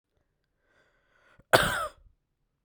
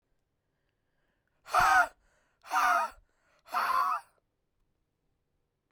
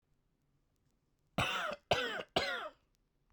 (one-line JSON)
{"cough_length": "2.6 s", "cough_amplitude": 28512, "cough_signal_mean_std_ratio": 0.23, "exhalation_length": "5.7 s", "exhalation_amplitude": 7721, "exhalation_signal_mean_std_ratio": 0.37, "three_cough_length": "3.3 s", "three_cough_amplitude": 4724, "three_cough_signal_mean_std_ratio": 0.43, "survey_phase": "beta (2021-08-13 to 2022-03-07)", "age": "18-44", "gender": "Male", "wearing_mask": "No", "symptom_cough_any": true, "symptom_runny_or_blocked_nose": true, "symptom_shortness_of_breath": true, "symptom_fatigue": true, "symptom_headache": true, "symptom_change_to_sense_of_smell_or_taste": true, "symptom_loss_of_taste": true, "symptom_onset": "3 days", "smoker_status": "Current smoker (e-cigarettes or vapes only)", "respiratory_condition_asthma": false, "respiratory_condition_other": false, "recruitment_source": "Test and Trace", "submission_delay": "1 day", "covid_test_result": "Positive", "covid_test_method": "RT-qPCR", "covid_ct_value": 19.6, "covid_ct_gene": "ORF1ab gene", "covid_ct_mean": 20.3, "covid_viral_load": "220000 copies/ml", "covid_viral_load_category": "Low viral load (10K-1M copies/ml)"}